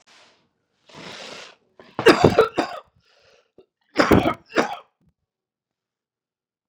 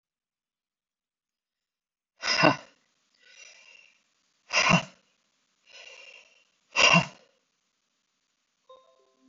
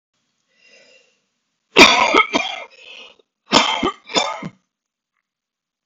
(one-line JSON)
{"three_cough_length": "6.7 s", "three_cough_amplitude": 32767, "three_cough_signal_mean_std_ratio": 0.28, "exhalation_length": "9.3 s", "exhalation_amplitude": 26618, "exhalation_signal_mean_std_ratio": 0.24, "cough_length": "5.9 s", "cough_amplitude": 32768, "cough_signal_mean_std_ratio": 0.33, "survey_phase": "beta (2021-08-13 to 2022-03-07)", "age": "45-64", "gender": "Male", "wearing_mask": "No", "symptom_cough_any": true, "symptom_sore_throat": true, "symptom_diarrhoea": true, "symptom_fatigue": true, "symptom_headache": true, "symptom_onset": "2 days", "smoker_status": "Never smoked", "respiratory_condition_asthma": false, "respiratory_condition_other": false, "recruitment_source": "Test and Trace", "submission_delay": "2 days", "covid_test_result": "Positive", "covid_test_method": "RT-qPCR", "covid_ct_value": 22.2, "covid_ct_gene": "ORF1ab gene", "covid_ct_mean": 22.8, "covid_viral_load": "34000 copies/ml", "covid_viral_load_category": "Low viral load (10K-1M copies/ml)"}